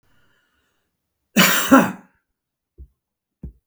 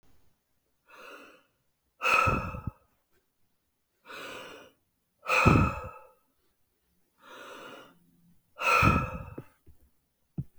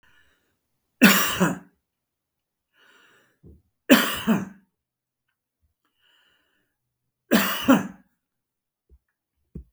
{"cough_length": "3.7 s", "cough_amplitude": 32768, "cough_signal_mean_std_ratio": 0.29, "exhalation_length": "10.6 s", "exhalation_amplitude": 15003, "exhalation_signal_mean_std_ratio": 0.34, "three_cough_length": "9.7 s", "three_cough_amplitude": 32766, "three_cough_signal_mean_std_ratio": 0.28, "survey_phase": "beta (2021-08-13 to 2022-03-07)", "age": "45-64", "gender": "Male", "wearing_mask": "No", "symptom_cough_any": true, "smoker_status": "Never smoked", "respiratory_condition_asthma": false, "respiratory_condition_other": false, "recruitment_source": "REACT", "submission_delay": "4 days", "covid_test_result": "Negative", "covid_test_method": "RT-qPCR", "influenza_a_test_result": "Negative", "influenza_b_test_result": "Negative"}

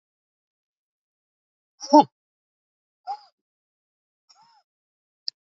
{"exhalation_length": "5.5 s", "exhalation_amplitude": 26871, "exhalation_signal_mean_std_ratio": 0.12, "survey_phase": "beta (2021-08-13 to 2022-03-07)", "age": "65+", "gender": "Female", "wearing_mask": "No", "symptom_none": true, "smoker_status": "Never smoked", "respiratory_condition_asthma": true, "respiratory_condition_other": false, "recruitment_source": "REACT", "submission_delay": "2 days", "covid_test_result": "Negative", "covid_test_method": "RT-qPCR", "influenza_a_test_result": "Negative", "influenza_b_test_result": "Negative"}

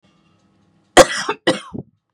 {"cough_length": "2.1 s", "cough_amplitude": 32768, "cough_signal_mean_std_ratio": 0.27, "survey_phase": "beta (2021-08-13 to 2022-03-07)", "age": "18-44", "gender": "Female", "wearing_mask": "No", "symptom_cough_any": true, "symptom_runny_or_blocked_nose": true, "symptom_sore_throat": true, "symptom_onset": "6 days", "smoker_status": "Never smoked", "respiratory_condition_asthma": false, "respiratory_condition_other": false, "recruitment_source": "Test and Trace", "submission_delay": "2 days", "covid_test_result": "Negative", "covid_test_method": "ePCR"}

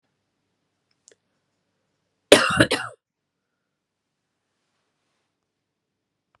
{"cough_length": "6.4 s", "cough_amplitude": 32768, "cough_signal_mean_std_ratio": 0.17, "survey_phase": "beta (2021-08-13 to 2022-03-07)", "age": "45-64", "gender": "Female", "wearing_mask": "No", "symptom_runny_or_blocked_nose": true, "symptom_fatigue": true, "symptom_fever_high_temperature": true, "symptom_headache": true, "smoker_status": "Ex-smoker", "respiratory_condition_asthma": false, "respiratory_condition_other": false, "recruitment_source": "Test and Trace", "submission_delay": "3 days", "covid_test_result": "Positive", "covid_test_method": "RT-qPCR"}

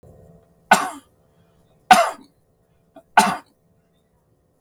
{"three_cough_length": "4.6 s", "three_cough_amplitude": 32768, "three_cough_signal_mean_std_ratio": 0.25, "survey_phase": "beta (2021-08-13 to 2022-03-07)", "age": "65+", "gender": "Male", "wearing_mask": "No", "symptom_none": true, "smoker_status": "Ex-smoker", "respiratory_condition_asthma": false, "respiratory_condition_other": false, "recruitment_source": "REACT", "submission_delay": "2 days", "covid_test_result": "Negative", "covid_test_method": "RT-qPCR", "influenza_a_test_result": "Negative", "influenza_b_test_result": "Negative"}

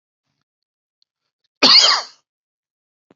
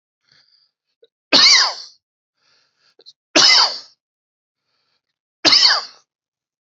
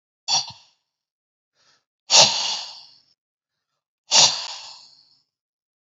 {"cough_length": "3.2 s", "cough_amplitude": 32767, "cough_signal_mean_std_ratio": 0.28, "three_cough_length": "6.7 s", "three_cough_amplitude": 32207, "three_cough_signal_mean_std_ratio": 0.34, "exhalation_length": "5.9 s", "exhalation_amplitude": 32767, "exhalation_signal_mean_std_ratio": 0.29, "survey_phase": "beta (2021-08-13 to 2022-03-07)", "age": "45-64", "gender": "Male", "wearing_mask": "No", "symptom_sore_throat": true, "smoker_status": "Never smoked", "respiratory_condition_asthma": false, "respiratory_condition_other": false, "recruitment_source": "REACT", "submission_delay": "1 day", "covid_test_result": "Negative", "covid_test_method": "RT-qPCR"}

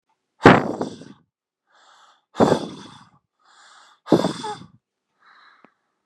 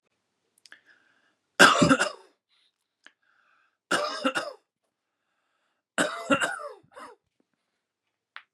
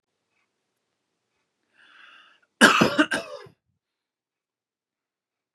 {"exhalation_length": "6.1 s", "exhalation_amplitude": 32768, "exhalation_signal_mean_std_ratio": 0.26, "three_cough_length": "8.5 s", "three_cough_amplitude": 26952, "three_cough_signal_mean_std_ratio": 0.28, "cough_length": "5.5 s", "cough_amplitude": 28876, "cough_signal_mean_std_ratio": 0.22, "survey_phase": "beta (2021-08-13 to 2022-03-07)", "age": "18-44", "gender": "Male", "wearing_mask": "No", "symptom_none": true, "smoker_status": "Never smoked", "respiratory_condition_asthma": true, "respiratory_condition_other": false, "recruitment_source": "REACT", "submission_delay": "3 days", "covid_test_result": "Negative", "covid_test_method": "RT-qPCR", "influenza_a_test_result": "Positive", "influenza_a_ct_value": 29.5, "influenza_b_test_result": "Negative"}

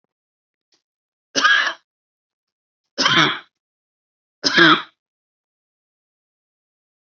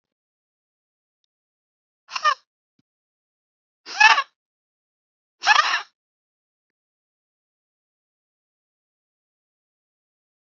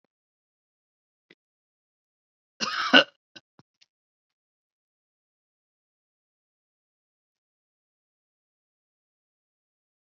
{"three_cough_length": "7.1 s", "three_cough_amplitude": 30446, "three_cough_signal_mean_std_ratio": 0.29, "exhalation_length": "10.5 s", "exhalation_amplitude": 27394, "exhalation_signal_mean_std_ratio": 0.19, "cough_length": "10.1 s", "cough_amplitude": 29186, "cough_signal_mean_std_ratio": 0.11, "survey_phase": "alpha (2021-03-01 to 2021-08-12)", "age": "45-64", "gender": "Female", "wearing_mask": "No", "symptom_none": true, "smoker_status": "Ex-smoker", "respiratory_condition_asthma": false, "respiratory_condition_other": false, "recruitment_source": "REACT", "submission_delay": "1 day", "covid_test_result": "Negative", "covid_test_method": "RT-qPCR"}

